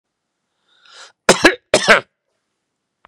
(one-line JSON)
{"cough_length": "3.1 s", "cough_amplitude": 32768, "cough_signal_mean_std_ratio": 0.27, "survey_phase": "beta (2021-08-13 to 2022-03-07)", "age": "45-64", "gender": "Male", "wearing_mask": "No", "symptom_runny_or_blocked_nose": true, "smoker_status": "Never smoked", "respiratory_condition_asthma": false, "respiratory_condition_other": false, "recruitment_source": "REACT", "submission_delay": "1 day", "covid_test_result": "Negative", "covid_test_method": "RT-qPCR", "influenza_a_test_result": "Negative", "influenza_b_test_result": "Negative"}